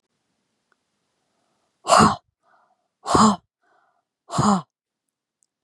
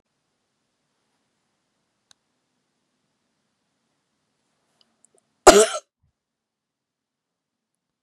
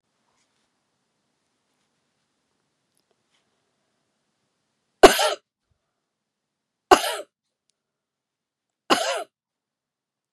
{"exhalation_length": "5.6 s", "exhalation_amplitude": 27993, "exhalation_signal_mean_std_ratio": 0.29, "cough_length": "8.0 s", "cough_amplitude": 32768, "cough_signal_mean_std_ratio": 0.12, "three_cough_length": "10.3 s", "three_cough_amplitude": 32768, "three_cough_signal_mean_std_ratio": 0.16, "survey_phase": "beta (2021-08-13 to 2022-03-07)", "age": "45-64", "gender": "Female", "wearing_mask": "No", "symptom_none": true, "smoker_status": "Never smoked", "respiratory_condition_asthma": false, "respiratory_condition_other": false, "recruitment_source": "REACT", "submission_delay": "1 day", "covid_test_result": "Negative", "covid_test_method": "RT-qPCR", "influenza_a_test_result": "Negative", "influenza_b_test_result": "Negative"}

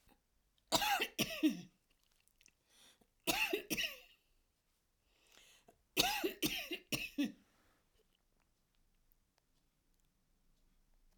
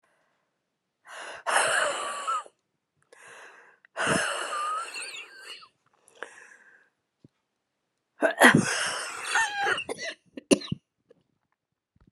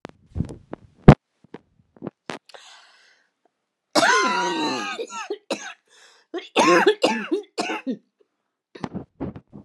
{"three_cough_length": "11.2 s", "three_cough_amplitude": 5330, "three_cough_signal_mean_std_ratio": 0.35, "exhalation_length": "12.1 s", "exhalation_amplitude": 29972, "exhalation_signal_mean_std_ratio": 0.4, "cough_length": "9.6 s", "cough_amplitude": 32768, "cough_signal_mean_std_ratio": 0.35, "survey_phase": "alpha (2021-03-01 to 2021-08-12)", "age": "45-64", "gender": "Female", "wearing_mask": "No", "symptom_none": true, "smoker_status": "Never smoked", "respiratory_condition_asthma": true, "respiratory_condition_other": false, "recruitment_source": "REACT", "submission_delay": "2 days", "covid_test_result": "Negative", "covid_test_method": "RT-qPCR"}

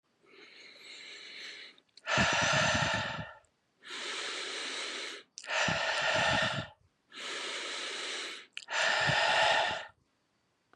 {"exhalation_length": "10.8 s", "exhalation_amplitude": 6402, "exhalation_signal_mean_std_ratio": 0.65, "survey_phase": "beta (2021-08-13 to 2022-03-07)", "age": "18-44", "gender": "Male", "wearing_mask": "No", "symptom_sore_throat": true, "symptom_onset": "7 days", "smoker_status": "Never smoked", "respiratory_condition_asthma": false, "respiratory_condition_other": false, "recruitment_source": "REACT", "submission_delay": "3 days", "covid_test_result": "Negative", "covid_test_method": "RT-qPCR", "influenza_a_test_result": "Negative", "influenza_b_test_result": "Negative"}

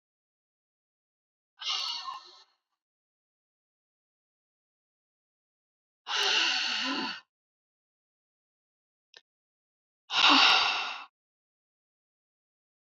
{"exhalation_length": "12.9 s", "exhalation_amplitude": 11303, "exhalation_signal_mean_std_ratio": 0.31, "survey_phase": "beta (2021-08-13 to 2022-03-07)", "age": "45-64", "gender": "Female", "wearing_mask": "No", "symptom_cough_any": true, "symptom_shortness_of_breath": true, "symptom_sore_throat": true, "symptom_onset": "12 days", "smoker_status": "Never smoked", "respiratory_condition_asthma": false, "respiratory_condition_other": true, "recruitment_source": "REACT", "submission_delay": "2 days", "covid_test_result": "Negative", "covid_test_method": "RT-qPCR"}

